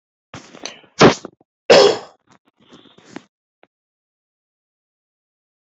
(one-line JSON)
{"cough_length": "5.6 s", "cough_amplitude": 31123, "cough_signal_mean_std_ratio": 0.23, "survey_phase": "beta (2021-08-13 to 2022-03-07)", "age": "65+", "gender": "Male", "wearing_mask": "No", "symptom_none": true, "smoker_status": "Ex-smoker", "respiratory_condition_asthma": false, "respiratory_condition_other": false, "recruitment_source": "REACT", "submission_delay": "1 day", "covid_test_result": "Negative", "covid_test_method": "RT-qPCR"}